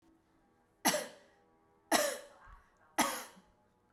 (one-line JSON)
{"three_cough_length": "3.9 s", "three_cough_amplitude": 5735, "three_cough_signal_mean_std_ratio": 0.34, "survey_phase": "beta (2021-08-13 to 2022-03-07)", "age": "45-64", "gender": "Female", "wearing_mask": "No", "symptom_none": true, "smoker_status": "Ex-smoker", "respiratory_condition_asthma": false, "respiratory_condition_other": false, "recruitment_source": "REACT", "submission_delay": "1 day", "covid_test_result": "Negative", "covid_test_method": "RT-qPCR"}